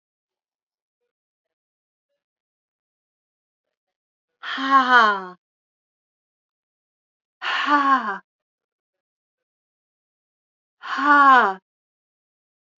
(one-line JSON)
{"exhalation_length": "12.8 s", "exhalation_amplitude": 28166, "exhalation_signal_mean_std_ratio": 0.29, "survey_phase": "beta (2021-08-13 to 2022-03-07)", "age": "65+", "gender": "Female", "wearing_mask": "No", "symptom_cough_any": true, "symptom_new_continuous_cough": true, "symptom_runny_or_blocked_nose": true, "symptom_shortness_of_breath": true, "symptom_sore_throat": true, "symptom_fatigue": true, "symptom_headache": true, "smoker_status": "Ex-smoker", "respiratory_condition_asthma": false, "respiratory_condition_other": false, "recruitment_source": "Test and Trace", "submission_delay": "1 day", "covid_test_result": "Positive", "covid_test_method": "RT-qPCR", "covid_ct_value": 15.8, "covid_ct_gene": "ORF1ab gene", "covid_ct_mean": 16.1, "covid_viral_load": "5200000 copies/ml", "covid_viral_load_category": "High viral load (>1M copies/ml)"}